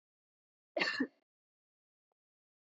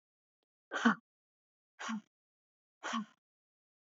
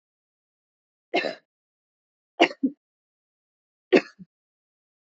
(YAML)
cough_length: 2.6 s
cough_amplitude: 3327
cough_signal_mean_std_ratio: 0.25
exhalation_length: 3.8 s
exhalation_amplitude: 5224
exhalation_signal_mean_std_ratio: 0.26
three_cough_length: 5.0 s
three_cough_amplitude: 23754
three_cough_signal_mean_std_ratio: 0.19
survey_phase: alpha (2021-03-01 to 2021-08-12)
age: 45-64
gender: Female
wearing_mask: 'No'
symptom_none: true
symptom_onset: 5 days
smoker_status: Never smoked
respiratory_condition_asthma: false
respiratory_condition_other: false
recruitment_source: REACT
submission_delay: 1 day
covid_test_result: Negative
covid_test_method: RT-qPCR